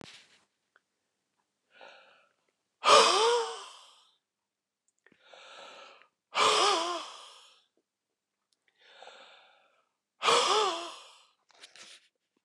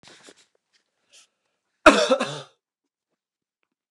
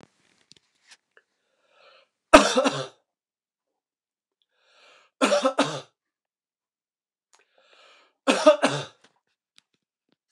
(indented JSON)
{
  "exhalation_length": "12.4 s",
  "exhalation_amplitude": 14780,
  "exhalation_signal_mean_std_ratio": 0.32,
  "cough_length": "3.9 s",
  "cough_amplitude": 29203,
  "cough_signal_mean_std_ratio": 0.22,
  "three_cough_length": "10.3 s",
  "three_cough_amplitude": 29204,
  "three_cough_signal_mean_std_ratio": 0.24,
  "survey_phase": "beta (2021-08-13 to 2022-03-07)",
  "age": "65+",
  "gender": "Male",
  "wearing_mask": "No",
  "symptom_none": true,
  "smoker_status": "Never smoked",
  "respiratory_condition_asthma": false,
  "respiratory_condition_other": false,
  "recruitment_source": "REACT",
  "submission_delay": "1 day",
  "covid_test_result": "Negative",
  "covid_test_method": "RT-qPCR"
}